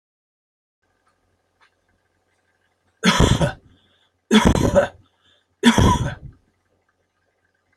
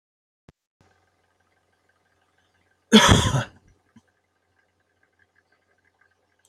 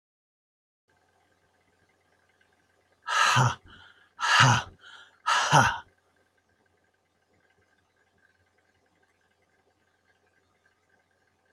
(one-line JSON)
{"three_cough_length": "7.8 s", "three_cough_amplitude": 29588, "three_cough_signal_mean_std_ratio": 0.33, "cough_length": "6.5 s", "cough_amplitude": 27988, "cough_signal_mean_std_ratio": 0.2, "exhalation_length": "11.5 s", "exhalation_amplitude": 17585, "exhalation_signal_mean_std_ratio": 0.28, "survey_phase": "alpha (2021-03-01 to 2021-08-12)", "age": "65+", "gender": "Male", "wearing_mask": "No", "symptom_none": true, "smoker_status": "Never smoked", "respiratory_condition_asthma": false, "respiratory_condition_other": false, "recruitment_source": "REACT", "submission_delay": "2 days", "covid_test_result": "Negative", "covid_test_method": "RT-qPCR"}